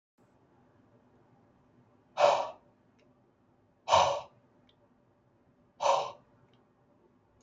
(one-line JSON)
{"exhalation_length": "7.4 s", "exhalation_amplitude": 10052, "exhalation_signal_mean_std_ratio": 0.27, "survey_phase": "beta (2021-08-13 to 2022-03-07)", "age": "65+", "gender": "Male", "wearing_mask": "No", "symptom_cough_any": true, "symptom_other": true, "smoker_status": "Ex-smoker", "respiratory_condition_asthma": false, "respiratory_condition_other": false, "recruitment_source": "Test and Trace", "submission_delay": "1 day", "covid_test_result": "Negative", "covid_test_method": "RT-qPCR"}